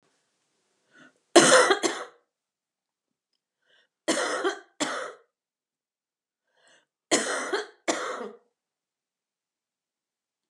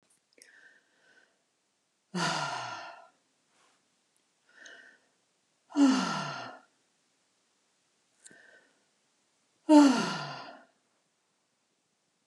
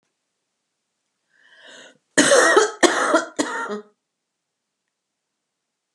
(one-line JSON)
{"three_cough_length": "10.5 s", "three_cough_amplitude": 27020, "three_cough_signal_mean_std_ratio": 0.29, "exhalation_length": "12.3 s", "exhalation_amplitude": 14195, "exhalation_signal_mean_std_ratio": 0.26, "cough_length": "5.9 s", "cough_amplitude": 32577, "cough_signal_mean_std_ratio": 0.35, "survey_phase": "beta (2021-08-13 to 2022-03-07)", "age": "65+", "gender": "Female", "wearing_mask": "No", "symptom_none": true, "smoker_status": "Never smoked", "respiratory_condition_asthma": false, "respiratory_condition_other": false, "recruitment_source": "REACT", "submission_delay": "14 days", "covid_test_result": "Negative", "covid_test_method": "RT-qPCR", "influenza_a_test_result": "Negative", "influenza_b_test_result": "Negative"}